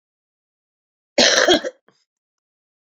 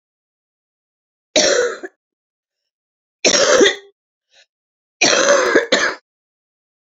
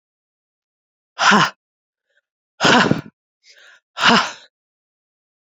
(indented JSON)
{
  "cough_length": "3.0 s",
  "cough_amplitude": 30912,
  "cough_signal_mean_std_ratio": 0.3,
  "three_cough_length": "7.0 s",
  "three_cough_amplitude": 32768,
  "three_cough_signal_mean_std_ratio": 0.41,
  "exhalation_length": "5.5 s",
  "exhalation_amplitude": 31072,
  "exhalation_signal_mean_std_ratio": 0.33,
  "survey_phase": "beta (2021-08-13 to 2022-03-07)",
  "age": "45-64",
  "gender": "Female",
  "wearing_mask": "No",
  "symptom_cough_any": true,
  "symptom_runny_or_blocked_nose": true,
  "symptom_sore_throat": true,
  "symptom_fatigue": true,
  "symptom_onset": "5 days",
  "smoker_status": "Current smoker (11 or more cigarettes per day)",
  "respiratory_condition_asthma": false,
  "respiratory_condition_other": false,
  "recruitment_source": "REACT",
  "submission_delay": "2 days",
  "covid_test_result": "Negative",
  "covid_test_method": "RT-qPCR"
}